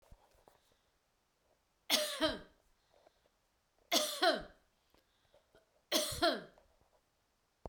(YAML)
three_cough_length: 7.7 s
three_cough_amplitude: 5631
three_cough_signal_mean_std_ratio: 0.33
survey_phase: beta (2021-08-13 to 2022-03-07)
age: 45-64
gender: Female
wearing_mask: 'No'
symptom_none: true
smoker_status: Never smoked
respiratory_condition_asthma: false
respiratory_condition_other: false
recruitment_source: REACT
submission_delay: 2 days
covid_test_result: Negative
covid_test_method: RT-qPCR